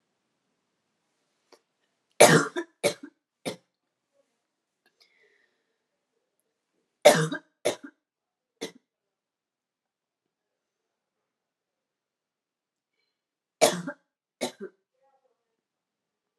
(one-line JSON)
{"three_cough_length": "16.4 s", "three_cough_amplitude": 28050, "three_cough_signal_mean_std_ratio": 0.17, "survey_phase": "alpha (2021-03-01 to 2021-08-12)", "age": "18-44", "gender": "Female", "wearing_mask": "No", "symptom_cough_any": true, "symptom_shortness_of_breath": true, "symptom_fatigue": true, "symptom_headache": true, "symptom_change_to_sense_of_smell_or_taste": true, "smoker_status": "Ex-smoker", "respiratory_condition_asthma": false, "respiratory_condition_other": false, "recruitment_source": "Test and Trace", "submission_delay": "1 day", "covid_test_result": "Positive", "covid_test_method": "RT-qPCR"}